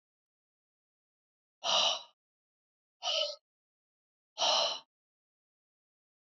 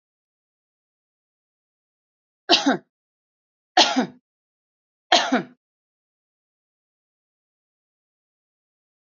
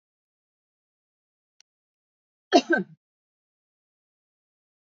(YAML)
exhalation_length: 6.2 s
exhalation_amplitude: 5085
exhalation_signal_mean_std_ratio: 0.32
three_cough_length: 9.0 s
three_cough_amplitude: 32768
three_cough_signal_mean_std_ratio: 0.21
cough_length: 4.9 s
cough_amplitude: 21749
cough_signal_mean_std_ratio: 0.15
survey_phase: alpha (2021-03-01 to 2021-08-12)
age: 45-64
gender: Female
wearing_mask: 'No'
symptom_none: true
smoker_status: Ex-smoker
respiratory_condition_asthma: false
respiratory_condition_other: false
recruitment_source: REACT
submission_delay: 1 day
covid_test_result: Negative
covid_test_method: RT-qPCR